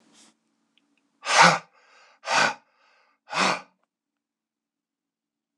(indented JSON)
{
  "exhalation_length": "5.6 s",
  "exhalation_amplitude": 25590,
  "exhalation_signal_mean_std_ratio": 0.28,
  "survey_phase": "beta (2021-08-13 to 2022-03-07)",
  "age": "65+",
  "gender": "Male",
  "wearing_mask": "No",
  "symptom_cough_any": true,
  "symptom_runny_or_blocked_nose": true,
  "smoker_status": "Never smoked",
  "respiratory_condition_asthma": false,
  "respiratory_condition_other": false,
  "recruitment_source": "REACT",
  "submission_delay": "0 days",
  "covid_test_result": "Negative",
  "covid_test_method": "RT-qPCR",
  "influenza_a_test_result": "Negative",
  "influenza_b_test_result": "Negative"
}